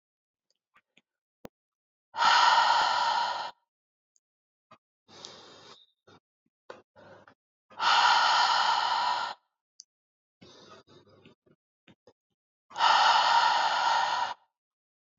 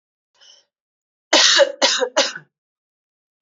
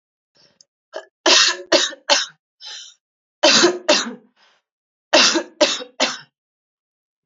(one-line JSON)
{"exhalation_length": "15.2 s", "exhalation_amplitude": 10582, "exhalation_signal_mean_std_ratio": 0.46, "cough_length": "3.4 s", "cough_amplitude": 32767, "cough_signal_mean_std_ratio": 0.37, "three_cough_length": "7.3 s", "three_cough_amplitude": 32767, "three_cough_signal_mean_std_ratio": 0.4, "survey_phase": "beta (2021-08-13 to 2022-03-07)", "age": "18-44", "gender": "Female", "wearing_mask": "No", "symptom_runny_or_blocked_nose": true, "symptom_change_to_sense_of_smell_or_taste": true, "symptom_loss_of_taste": true, "symptom_onset": "4 days", "smoker_status": "Never smoked", "respiratory_condition_asthma": false, "respiratory_condition_other": false, "recruitment_source": "Test and Trace", "submission_delay": "2 days", "covid_test_result": "Positive", "covid_test_method": "RT-qPCR"}